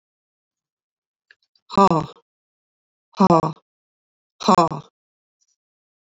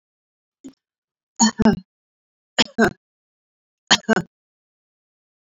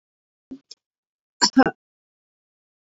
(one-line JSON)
{"exhalation_length": "6.1 s", "exhalation_amplitude": 28349, "exhalation_signal_mean_std_ratio": 0.26, "three_cough_length": "5.5 s", "three_cough_amplitude": 30117, "three_cough_signal_mean_std_ratio": 0.25, "cough_length": "3.0 s", "cough_amplitude": 26954, "cough_signal_mean_std_ratio": 0.18, "survey_phase": "beta (2021-08-13 to 2022-03-07)", "age": "65+", "gender": "Female", "wearing_mask": "No", "symptom_none": true, "smoker_status": "Ex-smoker", "respiratory_condition_asthma": false, "respiratory_condition_other": false, "recruitment_source": "REACT", "submission_delay": "1 day", "covid_test_result": "Negative", "covid_test_method": "RT-qPCR", "influenza_a_test_result": "Negative", "influenza_b_test_result": "Negative"}